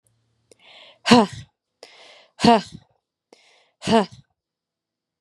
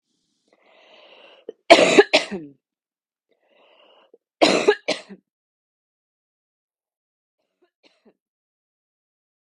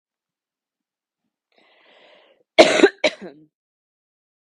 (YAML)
exhalation_length: 5.2 s
exhalation_amplitude: 32767
exhalation_signal_mean_std_ratio: 0.25
three_cough_length: 9.5 s
three_cough_amplitude: 32768
three_cough_signal_mean_std_ratio: 0.21
cough_length: 4.5 s
cough_amplitude: 32768
cough_signal_mean_std_ratio: 0.2
survey_phase: beta (2021-08-13 to 2022-03-07)
age: 18-44
gender: Male
wearing_mask: 'No'
symptom_cough_any: true
symptom_runny_or_blocked_nose: true
symptom_sore_throat: true
symptom_fatigue: true
symptom_headache: true
smoker_status: Never smoked
respiratory_condition_asthma: false
respiratory_condition_other: false
recruitment_source: Test and Trace
submission_delay: 2 days
covid_test_result: Positive
covid_test_method: LFT